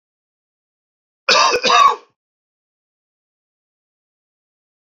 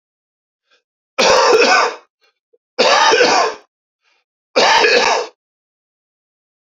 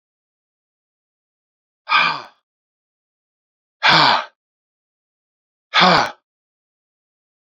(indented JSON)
{
  "cough_length": "4.9 s",
  "cough_amplitude": 32767,
  "cough_signal_mean_std_ratio": 0.29,
  "three_cough_length": "6.7 s",
  "three_cough_amplitude": 30747,
  "three_cough_signal_mean_std_ratio": 0.5,
  "exhalation_length": "7.5 s",
  "exhalation_amplitude": 31556,
  "exhalation_signal_mean_std_ratio": 0.29,
  "survey_phase": "beta (2021-08-13 to 2022-03-07)",
  "age": "45-64",
  "gender": "Male",
  "wearing_mask": "No",
  "symptom_cough_any": true,
  "symptom_sore_throat": true,
  "symptom_fatigue": true,
  "symptom_change_to_sense_of_smell_or_taste": true,
  "symptom_other": true,
  "smoker_status": "Never smoked",
  "respiratory_condition_asthma": false,
  "respiratory_condition_other": false,
  "recruitment_source": "Test and Trace",
  "submission_delay": "3 days",
  "covid_test_result": "Positive",
  "covid_test_method": "ePCR"
}